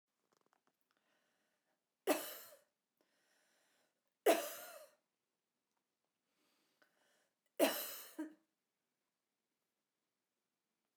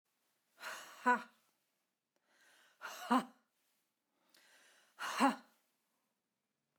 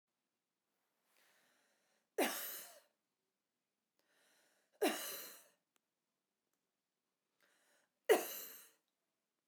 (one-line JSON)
{"cough_length": "11.0 s", "cough_amplitude": 3891, "cough_signal_mean_std_ratio": 0.21, "exhalation_length": "6.8 s", "exhalation_amplitude": 4228, "exhalation_signal_mean_std_ratio": 0.26, "three_cough_length": "9.5 s", "three_cough_amplitude": 4656, "three_cough_signal_mean_std_ratio": 0.23, "survey_phase": "beta (2021-08-13 to 2022-03-07)", "age": "45-64", "gender": "Female", "wearing_mask": "No", "symptom_none": true, "smoker_status": "Never smoked", "respiratory_condition_asthma": false, "respiratory_condition_other": false, "recruitment_source": "REACT", "submission_delay": "2 days", "covid_test_result": "Negative", "covid_test_method": "RT-qPCR", "influenza_a_test_result": "Negative", "influenza_b_test_result": "Negative"}